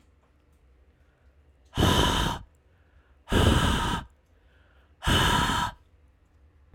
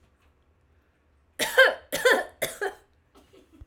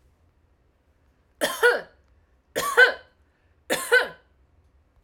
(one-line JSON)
{"exhalation_length": "6.7 s", "exhalation_amplitude": 12327, "exhalation_signal_mean_std_ratio": 0.47, "cough_length": "3.7 s", "cough_amplitude": 22186, "cough_signal_mean_std_ratio": 0.33, "three_cough_length": "5.0 s", "three_cough_amplitude": 23700, "three_cough_signal_mean_std_ratio": 0.32, "survey_phase": "beta (2021-08-13 to 2022-03-07)", "age": "18-44", "gender": "Female", "wearing_mask": "No", "symptom_none": true, "smoker_status": "Never smoked", "respiratory_condition_asthma": false, "respiratory_condition_other": false, "recruitment_source": "REACT", "submission_delay": "1 day", "covid_test_result": "Negative", "covid_test_method": "RT-qPCR", "influenza_a_test_result": "Negative", "influenza_b_test_result": "Negative"}